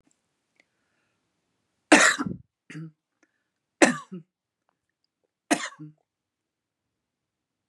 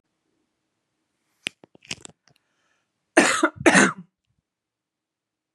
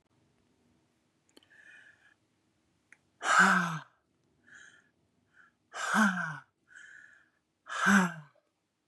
{
  "three_cough_length": "7.7 s",
  "three_cough_amplitude": 28831,
  "three_cough_signal_mean_std_ratio": 0.21,
  "cough_length": "5.5 s",
  "cough_amplitude": 29314,
  "cough_signal_mean_std_ratio": 0.24,
  "exhalation_length": "8.9 s",
  "exhalation_amplitude": 8911,
  "exhalation_signal_mean_std_ratio": 0.32,
  "survey_phase": "beta (2021-08-13 to 2022-03-07)",
  "age": "45-64",
  "gender": "Female",
  "wearing_mask": "No",
  "symptom_none": true,
  "symptom_onset": "7 days",
  "smoker_status": "Ex-smoker",
  "respiratory_condition_asthma": false,
  "respiratory_condition_other": false,
  "recruitment_source": "REACT",
  "submission_delay": "5 days",
  "covid_test_result": "Negative",
  "covid_test_method": "RT-qPCR",
  "influenza_a_test_result": "Negative",
  "influenza_b_test_result": "Negative"
}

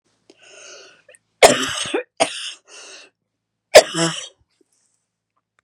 {
  "cough_length": "5.6 s",
  "cough_amplitude": 32768,
  "cough_signal_mean_std_ratio": 0.26,
  "survey_phase": "beta (2021-08-13 to 2022-03-07)",
  "age": "45-64",
  "gender": "Female",
  "wearing_mask": "No",
  "symptom_fatigue": true,
  "symptom_onset": "12 days",
  "smoker_status": "Never smoked",
  "respiratory_condition_asthma": false,
  "respiratory_condition_other": false,
  "recruitment_source": "REACT",
  "submission_delay": "2 days",
  "covid_test_result": "Negative",
  "covid_test_method": "RT-qPCR",
  "influenza_a_test_result": "Negative",
  "influenza_b_test_result": "Negative"
}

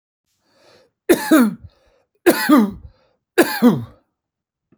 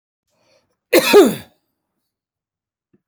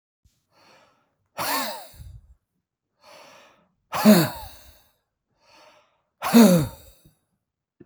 {
  "three_cough_length": "4.8 s",
  "three_cough_amplitude": 30405,
  "three_cough_signal_mean_std_ratio": 0.39,
  "cough_length": "3.1 s",
  "cough_amplitude": 32398,
  "cough_signal_mean_std_ratio": 0.28,
  "exhalation_length": "7.9 s",
  "exhalation_amplitude": 25898,
  "exhalation_signal_mean_std_ratio": 0.27,
  "survey_phase": "alpha (2021-03-01 to 2021-08-12)",
  "age": "65+",
  "gender": "Male",
  "wearing_mask": "No",
  "symptom_none": true,
  "smoker_status": "Never smoked",
  "respiratory_condition_asthma": false,
  "respiratory_condition_other": false,
  "recruitment_source": "REACT",
  "submission_delay": "2 days",
  "covid_test_result": "Negative",
  "covid_test_method": "RT-qPCR"
}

